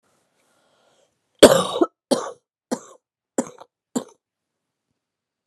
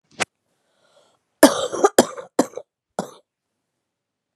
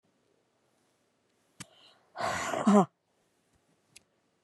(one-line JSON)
{"three_cough_length": "5.5 s", "three_cough_amplitude": 32768, "three_cough_signal_mean_std_ratio": 0.21, "cough_length": "4.4 s", "cough_amplitude": 32768, "cough_signal_mean_std_ratio": 0.23, "exhalation_length": "4.4 s", "exhalation_amplitude": 12568, "exhalation_signal_mean_std_ratio": 0.26, "survey_phase": "beta (2021-08-13 to 2022-03-07)", "age": "45-64", "gender": "Female", "wearing_mask": "No", "symptom_cough_any": true, "symptom_runny_or_blocked_nose": true, "symptom_shortness_of_breath": true, "symptom_abdominal_pain": true, "symptom_diarrhoea": true, "symptom_fatigue": true, "symptom_fever_high_temperature": true, "symptom_headache": true, "symptom_change_to_sense_of_smell_or_taste": true, "symptom_loss_of_taste": true, "symptom_onset": "4 days", "smoker_status": "Never smoked", "respiratory_condition_asthma": false, "respiratory_condition_other": false, "recruitment_source": "Test and Trace", "submission_delay": "1 day", "covid_test_result": "Positive", "covid_test_method": "RT-qPCR", "covid_ct_value": 25.3, "covid_ct_gene": "ORF1ab gene"}